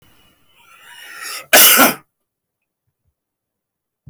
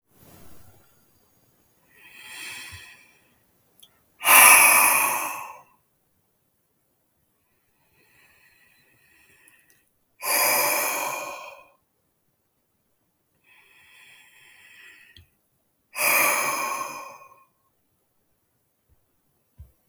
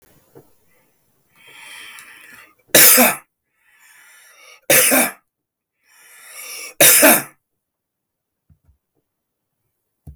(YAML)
cough_length: 4.1 s
cough_amplitude: 32768
cough_signal_mean_std_ratio: 0.29
exhalation_length: 19.9 s
exhalation_amplitude: 32766
exhalation_signal_mean_std_ratio: 0.29
three_cough_length: 10.2 s
three_cough_amplitude: 32768
three_cough_signal_mean_std_ratio: 0.3
survey_phase: beta (2021-08-13 to 2022-03-07)
age: 18-44
gender: Male
wearing_mask: 'No'
symptom_none: true
smoker_status: Never smoked
respiratory_condition_asthma: false
respiratory_condition_other: true
recruitment_source: REACT
submission_delay: 1 day
covid_test_result: Negative
covid_test_method: RT-qPCR